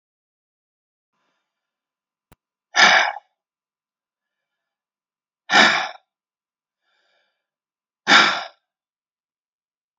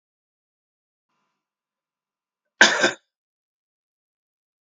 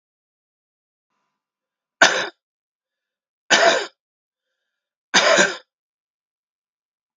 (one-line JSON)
{"exhalation_length": "10.0 s", "exhalation_amplitude": 32767, "exhalation_signal_mean_std_ratio": 0.24, "cough_length": "4.6 s", "cough_amplitude": 32768, "cough_signal_mean_std_ratio": 0.17, "three_cough_length": "7.2 s", "three_cough_amplitude": 32767, "three_cough_signal_mean_std_ratio": 0.28, "survey_phase": "beta (2021-08-13 to 2022-03-07)", "age": "65+", "gender": "Male", "wearing_mask": "No", "symptom_sore_throat": true, "symptom_onset": "3 days", "smoker_status": "Ex-smoker", "respiratory_condition_asthma": false, "respiratory_condition_other": false, "recruitment_source": "Test and Trace", "submission_delay": "1 day", "covid_test_result": "Negative", "covid_test_method": "RT-qPCR"}